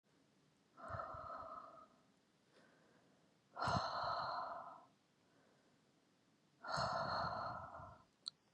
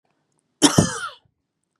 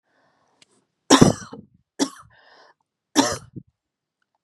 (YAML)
exhalation_length: 8.5 s
exhalation_amplitude: 1583
exhalation_signal_mean_std_ratio: 0.52
cough_length: 1.8 s
cough_amplitude: 32768
cough_signal_mean_std_ratio: 0.3
three_cough_length: 4.4 s
three_cough_amplitude: 32768
three_cough_signal_mean_std_ratio: 0.24
survey_phase: beta (2021-08-13 to 2022-03-07)
age: 18-44
gender: Female
wearing_mask: 'No'
symptom_none: true
smoker_status: Never smoked
respiratory_condition_asthma: false
respiratory_condition_other: false
recruitment_source: REACT
submission_delay: 1 day
covid_test_result: Negative
covid_test_method: RT-qPCR
influenza_a_test_result: Negative
influenza_b_test_result: Negative